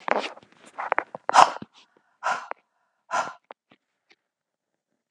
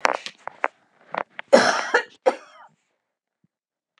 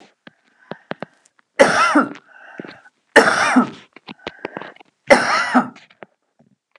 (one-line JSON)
{"exhalation_length": "5.1 s", "exhalation_amplitude": 32768, "exhalation_signal_mean_std_ratio": 0.24, "cough_length": "4.0 s", "cough_amplitude": 32768, "cough_signal_mean_std_ratio": 0.28, "three_cough_length": "6.8 s", "three_cough_amplitude": 32768, "three_cough_signal_mean_std_ratio": 0.38, "survey_phase": "beta (2021-08-13 to 2022-03-07)", "age": "45-64", "gender": "Female", "wearing_mask": "No", "symptom_none": true, "smoker_status": "Ex-smoker", "respiratory_condition_asthma": false, "respiratory_condition_other": false, "recruitment_source": "REACT", "submission_delay": "1 day", "covid_test_result": "Negative", "covid_test_method": "RT-qPCR"}